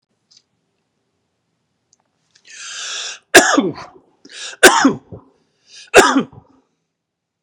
{"three_cough_length": "7.4 s", "three_cough_amplitude": 32768, "three_cough_signal_mean_std_ratio": 0.3, "survey_phase": "beta (2021-08-13 to 2022-03-07)", "age": "45-64", "gender": "Male", "wearing_mask": "No", "symptom_none": true, "smoker_status": "Ex-smoker", "respiratory_condition_asthma": true, "respiratory_condition_other": false, "recruitment_source": "REACT", "submission_delay": "2 days", "covid_test_result": "Negative", "covid_test_method": "RT-qPCR", "influenza_a_test_result": "Negative", "influenza_b_test_result": "Negative"}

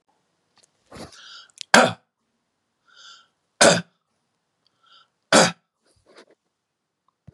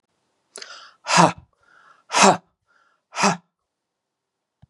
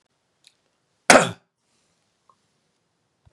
{"three_cough_length": "7.3 s", "three_cough_amplitude": 32767, "three_cough_signal_mean_std_ratio": 0.22, "exhalation_length": "4.7 s", "exhalation_amplitude": 32762, "exhalation_signal_mean_std_ratio": 0.29, "cough_length": "3.3 s", "cough_amplitude": 32768, "cough_signal_mean_std_ratio": 0.17, "survey_phase": "beta (2021-08-13 to 2022-03-07)", "age": "65+", "gender": "Male", "wearing_mask": "No", "symptom_cough_any": true, "symptom_onset": "3 days", "smoker_status": "Never smoked", "respiratory_condition_asthma": true, "respiratory_condition_other": false, "recruitment_source": "Test and Trace", "submission_delay": "1 day", "covid_test_result": "Positive", "covid_test_method": "RT-qPCR", "covid_ct_value": 25.6, "covid_ct_gene": "N gene"}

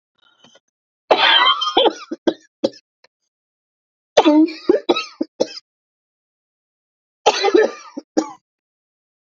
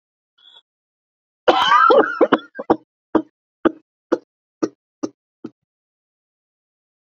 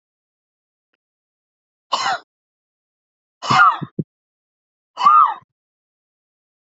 {"three_cough_length": "9.4 s", "three_cough_amplitude": 29797, "three_cough_signal_mean_std_ratio": 0.37, "cough_length": "7.1 s", "cough_amplitude": 28185, "cough_signal_mean_std_ratio": 0.3, "exhalation_length": "6.7 s", "exhalation_amplitude": 27326, "exhalation_signal_mean_std_ratio": 0.28, "survey_phase": "beta (2021-08-13 to 2022-03-07)", "age": "45-64", "gender": "Female", "wearing_mask": "No", "symptom_cough_any": true, "symptom_sore_throat": true, "symptom_fatigue": true, "symptom_headache": true, "symptom_onset": "8 days", "smoker_status": "Never smoked", "respiratory_condition_asthma": true, "respiratory_condition_other": false, "recruitment_source": "Test and Trace", "submission_delay": "2 days", "covid_test_result": "Negative", "covid_test_method": "RT-qPCR"}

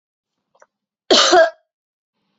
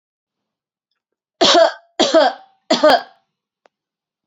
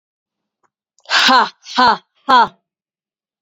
{"cough_length": "2.4 s", "cough_amplitude": 29221, "cough_signal_mean_std_ratio": 0.33, "three_cough_length": "4.3 s", "three_cough_amplitude": 30144, "three_cough_signal_mean_std_ratio": 0.37, "exhalation_length": "3.4 s", "exhalation_amplitude": 31490, "exhalation_signal_mean_std_ratio": 0.39, "survey_phase": "beta (2021-08-13 to 2022-03-07)", "age": "18-44", "gender": "Female", "wearing_mask": "No", "symptom_runny_or_blocked_nose": true, "smoker_status": "Ex-smoker", "respiratory_condition_asthma": false, "respiratory_condition_other": false, "recruitment_source": "REACT", "submission_delay": "1 day", "covid_test_result": "Negative", "covid_test_method": "RT-qPCR"}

